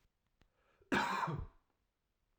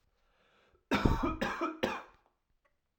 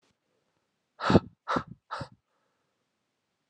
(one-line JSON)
{"cough_length": "2.4 s", "cough_amplitude": 3495, "cough_signal_mean_std_ratio": 0.39, "three_cough_length": "3.0 s", "three_cough_amplitude": 11269, "three_cough_signal_mean_std_ratio": 0.43, "exhalation_length": "3.5 s", "exhalation_amplitude": 18266, "exhalation_signal_mean_std_ratio": 0.22, "survey_phase": "alpha (2021-03-01 to 2021-08-12)", "age": "18-44", "gender": "Male", "wearing_mask": "No", "symptom_cough_any": true, "symptom_new_continuous_cough": true, "symptom_headache": true, "symptom_onset": "3 days", "smoker_status": "Never smoked", "respiratory_condition_asthma": false, "respiratory_condition_other": false, "recruitment_source": "Test and Trace", "submission_delay": "1 day", "covid_test_result": "Positive", "covid_test_method": "RT-qPCR", "covid_ct_value": 26.2, "covid_ct_gene": "ORF1ab gene"}